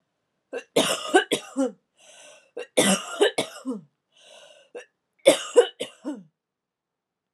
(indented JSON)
{
  "three_cough_length": "7.3 s",
  "three_cough_amplitude": 28004,
  "three_cough_signal_mean_std_ratio": 0.35,
  "survey_phase": "alpha (2021-03-01 to 2021-08-12)",
  "age": "18-44",
  "gender": "Female",
  "wearing_mask": "No",
  "symptom_cough_any": true,
  "symptom_fatigue": true,
  "symptom_headache": true,
  "symptom_change_to_sense_of_smell_or_taste": true,
  "smoker_status": "Ex-smoker",
  "respiratory_condition_asthma": false,
  "respiratory_condition_other": false,
  "recruitment_source": "Test and Trace",
  "submission_delay": "2 days",
  "covid_test_result": "Positive",
  "covid_test_method": "RT-qPCR",
  "covid_ct_value": 22.7,
  "covid_ct_gene": "ORF1ab gene",
  "covid_ct_mean": 23.0,
  "covid_viral_load": "30000 copies/ml",
  "covid_viral_load_category": "Low viral load (10K-1M copies/ml)"
}